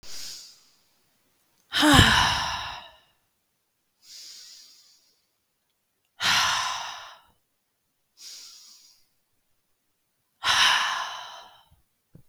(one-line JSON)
{"exhalation_length": "12.3 s", "exhalation_amplitude": 28855, "exhalation_signal_mean_std_ratio": 0.35, "survey_phase": "beta (2021-08-13 to 2022-03-07)", "age": "18-44", "gender": "Female", "wearing_mask": "No", "symptom_sore_throat": true, "symptom_fatigue": true, "symptom_headache": true, "symptom_onset": "1 day", "smoker_status": "Never smoked", "respiratory_condition_asthma": false, "respiratory_condition_other": false, "recruitment_source": "Test and Trace", "submission_delay": "1 day", "covid_test_result": "Positive", "covid_test_method": "RT-qPCR", "covid_ct_value": 20.7, "covid_ct_gene": "ORF1ab gene"}